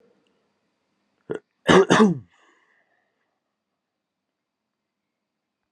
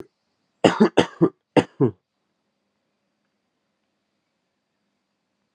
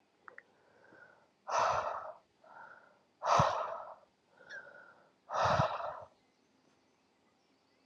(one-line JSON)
{"cough_length": "5.7 s", "cough_amplitude": 28520, "cough_signal_mean_std_ratio": 0.22, "three_cough_length": "5.5 s", "three_cough_amplitude": 31806, "three_cough_signal_mean_std_ratio": 0.22, "exhalation_length": "7.9 s", "exhalation_amplitude": 8331, "exhalation_signal_mean_std_ratio": 0.4, "survey_phase": "alpha (2021-03-01 to 2021-08-12)", "age": "18-44", "gender": "Male", "wearing_mask": "No", "symptom_cough_any": true, "symptom_shortness_of_breath": true, "symptom_fatigue": true, "symptom_headache": true, "symptom_change_to_sense_of_smell_or_taste": true, "symptom_loss_of_taste": true, "symptom_onset": "4 days", "smoker_status": "Never smoked", "respiratory_condition_asthma": false, "respiratory_condition_other": false, "recruitment_source": "Test and Trace", "submission_delay": "2 days", "covid_test_result": "Positive", "covid_test_method": "RT-qPCR"}